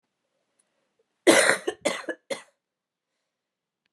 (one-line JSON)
{"cough_length": "3.9 s", "cough_amplitude": 25264, "cough_signal_mean_std_ratio": 0.27, "survey_phase": "beta (2021-08-13 to 2022-03-07)", "age": "18-44", "gender": "Female", "wearing_mask": "No", "symptom_cough_any": true, "symptom_runny_or_blocked_nose": true, "symptom_headache": true, "symptom_onset": "4 days", "smoker_status": "Ex-smoker", "respiratory_condition_asthma": false, "respiratory_condition_other": false, "recruitment_source": "Test and Trace", "submission_delay": "2 days", "covid_test_result": "Positive", "covid_test_method": "RT-qPCR", "covid_ct_value": 15.1, "covid_ct_gene": "ORF1ab gene"}